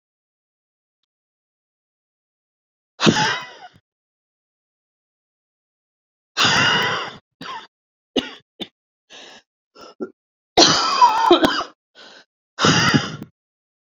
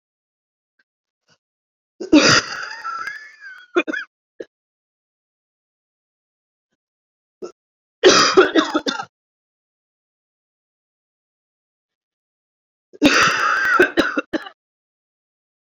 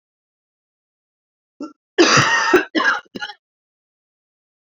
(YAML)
exhalation_length: 13.9 s
exhalation_amplitude: 30896
exhalation_signal_mean_std_ratio: 0.35
three_cough_length: 15.8 s
three_cough_amplitude: 30475
three_cough_signal_mean_std_ratio: 0.32
cough_length: 4.8 s
cough_amplitude: 28672
cough_signal_mean_std_ratio: 0.36
survey_phase: beta (2021-08-13 to 2022-03-07)
age: 18-44
gender: Female
wearing_mask: 'No'
symptom_cough_any: true
symptom_shortness_of_breath: true
symptom_sore_throat: true
symptom_onset: 4 days
smoker_status: Ex-smoker
respiratory_condition_asthma: false
respiratory_condition_other: false
recruitment_source: REACT
submission_delay: 1 day
covid_test_result: Negative
covid_test_method: RT-qPCR